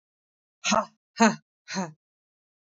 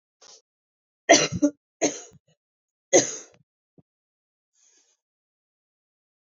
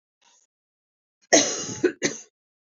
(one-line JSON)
{"exhalation_length": "2.7 s", "exhalation_amplitude": 19913, "exhalation_signal_mean_std_ratio": 0.29, "three_cough_length": "6.2 s", "three_cough_amplitude": 25347, "three_cough_signal_mean_std_ratio": 0.22, "cough_length": "2.7 s", "cough_amplitude": 25965, "cough_signal_mean_std_ratio": 0.31, "survey_phase": "beta (2021-08-13 to 2022-03-07)", "age": "18-44", "gender": "Female", "wearing_mask": "No", "symptom_cough_any": true, "symptom_runny_or_blocked_nose": true, "symptom_fatigue": true, "symptom_headache": true, "symptom_change_to_sense_of_smell_or_taste": true, "symptom_other": true, "symptom_onset": "3 days", "smoker_status": "Current smoker (1 to 10 cigarettes per day)", "respiratory_condition_asthma": false, "respiratory_condition_other": false, "recruitment_source": "Test and Trace", "submission_delay": "1 day", "covid_test_result": "Positive", "covid_test_method": "RT-qPCR", "covid_ct_value": 14.3, "covid_ct_gene": "N gene", "covid_ct_mean": 14.8, "covid_viral_load": "14000000 copies/ml", "covid_viral_load_category": "High viral load (>1M copies/ml)"}